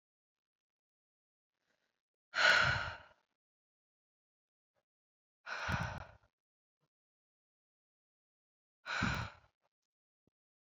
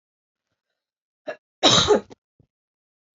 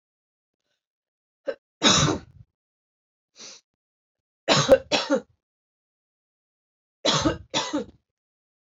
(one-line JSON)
{"exhalation_length": "10.7 s", "exhalation_amplitude": 4961, "exhalation_signal_mean_std_ratio": 0.26, "cough_length": "3.2 s", "cough_amplitude": 27523, "cough_signal_mean_std_ratio": 0.28, "three_cough_length": "8.7 s", "three_cough_amplitude": 23247, "three_cough_signal_mean_std_ratio": 0.31, "survey_phase": "alpha (2021-03-01 to 2021-08-12)", "age": "18-44", "gender": "Female", "wearing_mask": "No", "symptom_cough_any": true, "symptom_new_continuous_cough": true, "symptom_fatigue": true, "symptom_headache": true, "symptom_change_to_sense_of_smell_or_taste": true, "symptom_loss_of_taste": true, "symptom_onset": "5 days", "smoker_status": "Never smoked", "respiratory_condition_asthma": false, "respiratory_condition_other": false, "recruitment_source": "Test and Trace", "submission_delay": "2 days", "covid_test_result": "Positive", "covid_test_method": "RT-qPCR", "covid_ct_value": 22.3, "covid_ct_gene": "ORF1ab gene", "covid_ct_mean": 22.7, "covid_viral_load": "35000 copies/ml", "covid_viral_load_category": "Low viral load (10K-1M copies/ml)"}